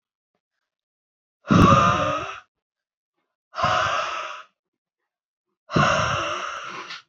{
  "exhalation_length": "7.1 s",
  "exhalation_amplitude": 25522,
  "exhalation_signal_mean_std_ratio": 0.45,
  "survey_phase": "alpha (2021-03-01 to 2021-08-12)",
  "age": "18-44",
  "gender": "Female",
  "wearing_mask": "No",
  "symptom_cough_any": true,
  "symptom_shortness_of_breath": true,
  "symptom_abdominal_pain": true,
  "symptom_fatigue": true,
  "symptom_onset": "3 days",
  "smoker_status": "Never smoked",
  "respiratory_condition_asthma": false,
  "respiratory_condition_other": false,
  "recruitment_source": "Test and Trace",
  "submission_delay": "2 days",
  "covid_test_result": "Positive",
  "covid_test_method": "RT-qPCR"
}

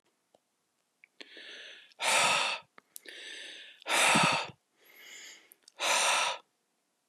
{
  "exhalation_length": "7.1 s",
  "exhalation_amplitude": 10029,
  "exhalation_signal_mean_std_ratio": 0.45,
  "survey_phase": "beta (2021-08-13 to 2022-03-07)",
  "age": "45-64",
  "gender": "Male",
  "wearing_mask": "No",
  "symptom_cough_any": true,
  "symptom_runny_or_blocked_nose": true,
  "symptom_fatigue": true,
  "symptom_headache": true,
  "symptom_onset": "3 days",
  "smoker_status": "Current smoker (e-cigarettes or vapes only)",
  "respiratory_condition_asthma": false,
  "respiratory_condition_other": false,
  "recruitment_source": "Test and Trace",
  "submission_delay": "2 days",
  "covid_test_result": "Positive",
  "covid_test_method": "RT-qPCR",
  "covid_ct_value": 15.7,
  "covid_ct_gene": "ORF1ab gene",
  "covid_ct_mean": 16.2,
  "covid_viral_load": "5000000 copies/ml",
  "covid_viral_load_category": "High viral load (>1M copies/ml)"
}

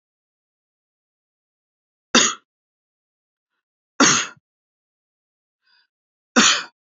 {
  "three_cough_length": "6.9 s",
  "three_cough_amplitude": 28243,
  "three_cough_signal_mean_std_ratio": 0.24,
  "survey_phase": "beta (2021-08-13 to 2022-03-07)",
  "age": "18-44",
  "gender": "Male",
  "wearing_mask": "No",
  "symptom_none": true,
  "smoker_status": "Never smoked",
  "respiratory_condition_asthma": false,
  "respiratory_condition_other": false,
  "recruitment_source": "REACT",
  "submission_delay": "1 day",
  "covid_test_result": "Negative",
  "covid_test_method": "RT-qPCR",
  "influenza_a_test_result": "Negative",
  "influenza_b_test_result": "Negative"
}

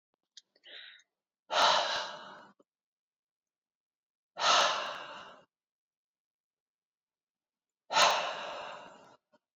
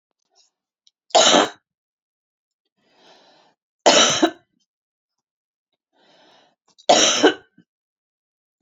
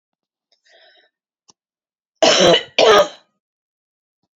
{
  "exhalation_length": "9.6 s",
  "exhalation_amplitude": 9067,
  "exhalation_signal_mean_std_ratio": 0.34,
  "three_cough_length": "8.6 s",
  "three_cough_amplitude": 32322,
  "three_cough_signal_mean_std_ratio": 0.29,
  "cough_length": "4.4 s",
  "cough_amplitude": 30763,
  "cough_signal_mean_std_ratio": 0.33,
  "survey_phase": "beta (2021-08-13 to 2022-03-07)",
  "age": "45-64",
  "gender": "Female",
  "wearing_mask": "No",
  "symptom_none": true,
  "smoker_status": "Ex-smoker",
  "respiratory_condition_asthma": false,
  "respiratory_condition_other": false,
  "recruitment_source": "REACT",
  "submission_delay": "1 day",
  "covid_test_result": "Negative",
  "covid_test_method": "RT-qPCR"
}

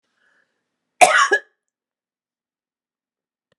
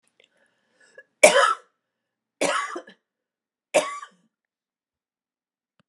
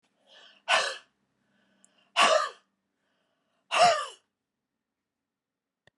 {
  "cough_length": "3.6 s",
  "cough_amplitude": 32768,
  "cough_signal_mean_std_ratio": 0.23,
  "three_cough_length": "5.9 s",
  "three_cough_amplitude": 32768,
  "three_cough_signal_mean_std_ratio": 0.25,
  "exhalation_length": "6.0 s",
  "exhalation_amplitude": 11849,
  "exhalation_signal_mean_std_ratio": 0.3,
  "survey_phase": "beta (2021-08-13 to 2022-03-07)",
  "age": "65+",
  "gender": "Female",
  "wearing_mask": "No",
  "symptom_none": true,
  "smoker_status": "Never smoked",
  "respiratory_condition_asthma": false,
  "respiratory_condition_other": false,
  "recruitment_source": "REACT",
  "submission_delay": "14 days",
  "covid_test_result": "Negative",
  "covid_test_method": "RT-qPCR"
}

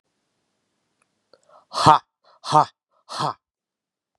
{
  "exhalation_length": "4.2 s",
  "exhalation_amplitude": 32768,
  "exhalation_signal_mean_std_ratio": 0.23,
  "survey_phase": "beta (2021-08-13 to 2022-03-07)",
  "age": "45-64",
  "gender": "Male",
  "wearing_mask": "No",
  "symptom_cough_any": true,
  "symptom_runny_or_blocked_nose": true,
  "symptom_onset": "2 days",
  "smoker_status": "Ex-smoker",
  "respiratory_condition_asthma": false,
  "respiratory_condition_other": false,
  "recruitment_source": "Test and Trace",
  "submission_delay": "2 days",
  "covid_test_result": "Positive",
  "covid_test_method": "RT-qPCR"
}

